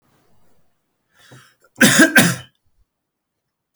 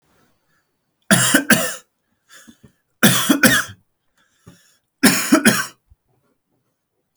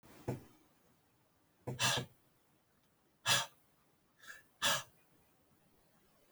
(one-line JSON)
{"cough_length": "3.8 s", "cough_amplitude": 32768, "cough_signal_mean_std_ratio": 0.29, "three_cough_length": "7.2 s", "three_cough_amplitude": 32768, "three_cough_signal_mean_std_ratio": 0.37, "exhalation_length": "6.3 s", "exhalation_amplitude": 3709, "exhalation_signal_mean_std_ratio": 0.31, "survey_phase": "alpha (2021-03-01 to 2021-08-12)", "age": "45-64", "gender": "Male", "wearing_mask": "No", "symptom_none": true, "smoker_status": "Never smoked", "respiratory_condition_asthma": false, "respiratory_condition_other": false, "recruitment_source": "REACT", "submission_delay": "5 days", "covid_test_result": "Negative", "covid_test_method": "RT-qPCR"}